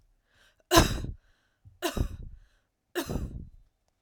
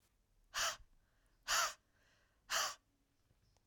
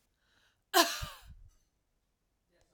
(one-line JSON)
{"three_cough_length": "4.0 s", "three_cough_amplitude": 23989, "three_cough_signal_mean_std_ratio": 0.34, "exhalation_length": "3.7 s", "exhalation_amplitude": 2341, "exhalation_signal_mean_std_ratio": 0.36, "cough_length": "2.7 s", "cough_amplitude": 9463, "cough_signal_mean_std_ratio": 0.23, "survey_phase": "alpha (2021-03-01 to 2021-08-12)", "age": "18-44", "gender": "Female", "wearing_mask": "No", "symptom_none": true, "smoker_status": "Never smoked", "respiratory_condition_asthma": true, "respiratory_condition_other": false, "recruitment_source": "REACT", "submission_delay": "2 days", "covid_test_result": "Negative", "covid_test_method": "RT-qPCR"}